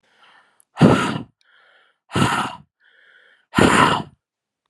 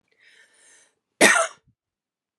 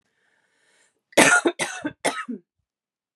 {"exhalation_length": "4.7 s", "exhalation_amplitude": 32444, "exhalation_signal_mean_std_ratio": 0.39, "cough_length": "2.4 s", "cough_amplitude": 28347, "cough_signal_mean_std_ratio": 0.26, "three_cough_length": "3.2 s", "three_cough_amplitude": 32736, "three_cough_signal_mean_std_ratio": 0.33, "survey_phase": "beta (2021-08-13 to 2022-03-07)", "age": "18-44", "gender": "Female", "wearing_mask": "No", "symptom_runny_or_blocked_nose": true, "smoker_status": "Never smoked", "respiratory_condition_asthma": true, "respiratory_condition_other": false, "recruitment_source": "REACT", "submission_delay": "1 day", "covid_test_result": "Negative", "covid_test_method": "RT-qPCR"}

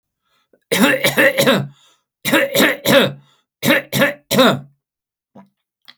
{"three_cough_length": "6.0 s", "three_cough_amplitude": 32767, "three_cough_signal_mean_std_ratio": 0.52, "survey_phase": "alpha (2021-03-01 to 2021-08-12)", "age": "65+", "gender": "Male", "wearing_mask": "No", "symptom_none": true, "smoker_status": "Never smoked", "respiratory_condition_asthma": false, "respiratory_condition_other": false, "recruitment_source": "REACT", "submission_delay": "1 day", "covid_test_result": "Negative", "covid_test_method": "RT-qPCR"}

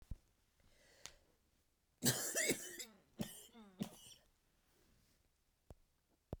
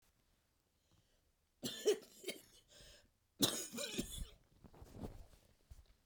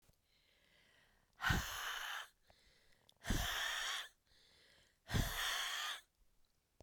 {"three_cough_length": "6.4 s", "three_cough_amplitude": 3458, "three_cough_signal_mean_std_ratio": 0.32, "cough_length": "6.1 s", "cough_amplitude": 3863, "cough_signal_mean_std_ratio": 0.35, "exhalation_length": "6.8 s", "exhalation_amplitude": 2664, "exhalation_signal_mean_std_ratio": 0.51, "survey_phase": "beta (2021-08-13 to 2022-03-07)", "age": "45-64", "gender": "Female", "wearing_mask": "No", "symptom_cough_any": true, "symptom_runny_or_blocked_nose": true, "symptom_sore_throat": true, "symptom_headache": true, "symptom_other": true, "symptom_onset": "2 days", "smoker_status": "Never smoked", "respiratory_condition_asthma": false, "respiratory_condition_other": true, "recruitment_source": "Test and Trace", "submission_delay": "1 day", "covid_test_result": "Positive", "covid_test_method": "RT-qPCR", "covid_ct_value": 20.4, "covid_ct_gene": "ORF1ab gene", "covid_ct_mean": 20.5, "covid_viral_load": "190000 copies/ml", "covid_viral_load_category": "Low viral load (10K-1M copies/ml)"}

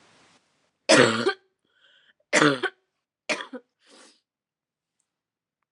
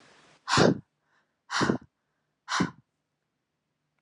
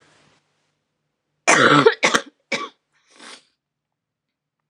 {"three_cough_length": "5.7 s", "three_cough_amplitude": 27199, "three_cough_signal_mean_std_ratio": 0.28, "exhalation_length": "4.0 s", "exhalation_amplitude": 14554, "exhalation_signal_mean_std_ratio": 0.32, "cough_length": "4.7 s", "cough_amplitude": 32767, "cough_signal_mean_std_ratio": 0.3, "survey_phase": "alpha (2021-03-01 to 2021-08-12)", "age": "18-44", "gender": "Female", "wearing_mask": "No", "symptom_cough_any": true, "symptom_shortness_of_breath": true, "symptom_abdominal_pain": true, "symptom_fever_high_temperature": true, "symptom_headache": true, "symptom_change_to_sense_of_smell_or_taste": true, "symptom_onset": "2 days", "smoker_status": "Current smoker (e-cigarettes or vapes only)", "respiratory_condition_asthma": false, "respiratory_condition_other": false, "recruitment_source": "Test and Trace", "submission_delay": "1 day", "covid_test_result": "Positive", "covid_test_method": "RT-qPCR", "covid_ct_value": 17.4, "covid_ct_gene": "ORF1ab gene", "covid_ct_mean": 17.7, "covid_viral_load": "1500000 copies/ml", "covid_viral_load_category": "High viral load (>1M copies/ml)"}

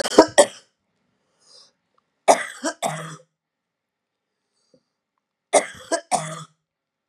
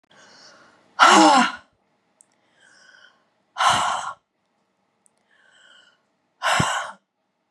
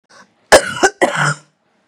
{"three_cough_length": "7.1 s", "three_cough_amplitude": 32768, "three_cough_signal_mean_std_ratio": 0.25, "exhalation_length": "7.5 s", "exhalation_amplitude": 28441, "exhalation_signal_mean_std_ratio": 0.33, "cough_length": "1.9 s", "cough_amplitude": 32768, "cough_signal_mean_std_ratio": 0.4, "survey_phase": "beta (2021-08-13 to 2022-03-07)", "age": "45-64", "gender": "Female", "wearing_mask": "No", "symptom_cough_any": true, "symptom_onset": "6 days", "smoker_status": "Never smoked", "respiratory_condition_asthma": false, "respiratory_condition_other": true, "recruitment_source": "REACT", "submission_delay": "3 days", "covid_test_result": "Negative", "covid_test_method": "RT-qPCR", "influenza_a_test_result": "Unknown/Void", "influenza_b_test_result": "Unknown/Void"}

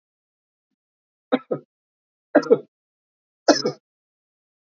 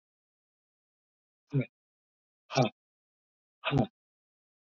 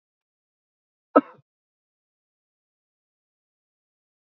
{"three_cough_length": "4.8 s", "three_cough_amplitude": 26766, "three_cough_signal_mean_std_ratio": 0.21, "exhalation_length": "4.7 s", "exhalation_amplitude": 7932, "exhalation_signal_mean_std_ratio": 0.24, "cough_length": "4.4 s", "cough_amplitude": 26214, "cough_signal_mean_std_ratio": 0.08, "survey_phase": "beta (2021-08-13 to 2022-03-07)", "age": "45-64", "gender": "Male", "wearing_mask": "No", "symptom_cough_any": true, "symptom_runny_or_blocked_nose": true, "smoker_status": "Ex-smoker", "respiratory_condition_asthma": false, "respiratory_condition_other": false, "recruitment_source": "Test and Trace", "submission_delay": "2 days", "covid_test_result": "Negative", "covid_test_method": "RT-qPCR"}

